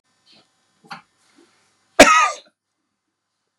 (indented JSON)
{
  "cough_length": "3.6 s",
  "cough_amplitude": 32768,
  "cough_signal_mean_std_ratio": 0.23,
  "survey_phase": "beta (2021-08-13 to 2022-03-07)",
  "age": "65+",
  "gender": "Male",
  "wearing_mask": "No",
  "symptom_none": true,
  "smoker_status": "Ex-smoker",
  "respiratory_condition_asthma": false,
  "respiratory_condition_other": false,
  "recruitment_source": "REACT",
  "submission_delay": "1 day",
  "covid_test_result": "Negative",
  "covid_test_method": "RT-qPCR",
  "influenza_a_test_result": "Negative",
  "influenza_b_test_result": "Negative"
}